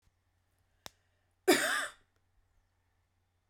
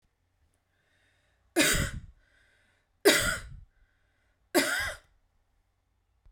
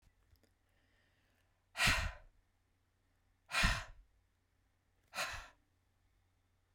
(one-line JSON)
{"cough_length": "3.5 s", "cough_amplitude": 8080, "cough_signal_mean_std_ratio": 0.25, "three_cough_length": "6.3 s", "three_cough_amplitude": 13998, "three_cough_signal_mean_std_ratio": 0.32, "exhalation_length": "6.7 s", "exhalation_amplitude": 4742, "exhalation_signal_mean_std_ratio": 0.29, "survey_phase": "beta (2021-08-13 to 2022-03-07)", "age": "18-44", "gender": "Female", "wearing_mask": "No", "symptom_none": true, "smoker_status": "Current smoker (1 to 10 cigarettes per day)", "respiratory_condition_asthma": false, "respiratory_condition_other": false, "recruitment_source": "REACT", "submission_delay": "2 days", "covid_test_result": "Negative", "covid_test_method": "RT-qPCR"}